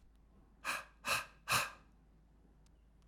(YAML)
exhalation_length: 3.1 s
exhalation_amplitude: 3060
exhalation_signal_mean_std_ratio: 0.39
survey_phase: alpha (2021-03-01 to 2021-08-12)
age: 45-64
gender: Male
wearing_mask: 'No'
symptom_fatigue: true
symptom_change_to_sense_of_smell_or_taste: true
symptom_onset: 12 days
smoker_status: Never smoked
respiratory_condition_asthma: false
respiratory_condition_other: false
recruitment_source: REACT
submission_delay: 1 day
covid_test_result: Negative
covid_test_method: RT-qPCR